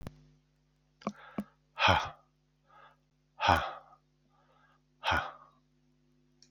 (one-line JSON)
{"exhalation_length": "6.5 s", "exhalation_amplitude": 13102, "exhalation_signal_mean_std_ratio": 0.29, "survey_phase": "beta (2021-08-13 to 2022-03-07)", "age": "45-64", "gender": "Male", "wearing_mask": "No", "symptom_cough_any": true, "symptom_runny_or_blocked_nose": true, "symptom_shortness_of_breath": true, "symptom_fatigue": true, "symptom_change_to_sense_of_smell_or_taste": true, "symptom_onset": "11 days", "smoker_status": "Never smoked", "respiratory_condition_asthma": false, "respiratory_condition_other": false, "recruitment_source": "REACT", "submission_delay": "2 days", "covid_test_result": "Positive", "covid_test_method": "RT-qPCR", "covid_ct_value": 24.0, "covid_ct_gene": "E gene", "influenza_a_test_result": "Negative", "influenza_b_test_result": "Negative"}